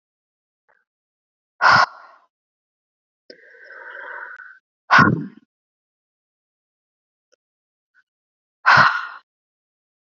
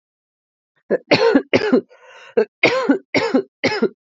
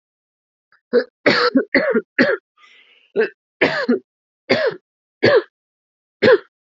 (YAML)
exhalation_length: 10.1 s
exhalation_amplitude: 28624
exhalation_signal_mean_std_ratio: 0.25
cough_length: 4.2 s
cough_amplitude: 29078
cough_signal_mean_std_ratio: 0.49
three_cough_length: 6.7 s
three_cough_amplitude: 28477
three_cough_signal_mean_std_ratio: 0.43
survey_phase: alpha (2021-03-01 to 2021-08-12)
age: 18-44
gender: Female
wearing_mask: 'No'
symptom_cough_any: true
symptom_abdominal_pain: true
symptom_fatigue: true
symptom_fever_high_temperature: true
symptom_headache: true
symptom_onset: 7 days
smoker_status: Never smoked
respiratory_condition_asthma: false
respiratory_condition_other: false
recruitment_source: Test and Trace
submission_delay: 2 days
covid_test_result: Positive
covid_test_method: RT-qPCR
covid_ct_value: 16.3
covid_ct_gene: N gene
covid_ct_mean: 16.7
covid_viral_load: 3300000 copies/ml
covid_viral_load_category: High viral load (>1M copies/ml)